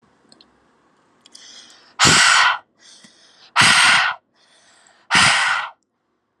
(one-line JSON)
{"exhalation_length": "6.4 s", "exhalation_amplitude": 31812, "exhalation_signal_mean_std_ratio": 0.44, "survey_phase": "alpha (2021-03-01 to 2021-08-12)", "age": "18-44", "gender": "Female", "wearing_mask": "No", "symptom_cough_any": true, "symptom_new_continuous_cough": true, "symptom_diarrhoea": true, "symptom_fatigue": true, "symptom_headache": true, "smoker_status": "Never smoked", "respiratory_condition_asthma": false, "respiratory_condition_other": false, "recruitment_source": "Test and Trace", "submission_delay": "3 days", "covid_test_result": "Positive", "covid_test_method": "RT-qPCR", "covid_ct_value": 32.3, "covid_ct_gene": "ORF1ab gene"}